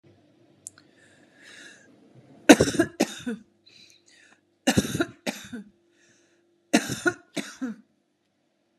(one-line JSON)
{"three_cough_length": "8.8 s", "three_cough_amplitude": 32767, "three_cough_signal_mean_std_ratio": 0.25, "survey_phase": "beta (2021-08-13 to 2022-03-07)", "age": "45-64", "gender": "Female", "wearing_mask": "No", "symptom_none": true, "smoker_status": "Ex-smoker", "respiratory_condition_asthma": true, "respiratory_condition_other": true, "recruitment_source": "REACT", "submission_delay": "1 day", "covid_test_result": "Negative", "covid_test_method": "RT-qPCR", "influenza_a_test_result": "Negative", "influenza_b_test_result": "Negative"}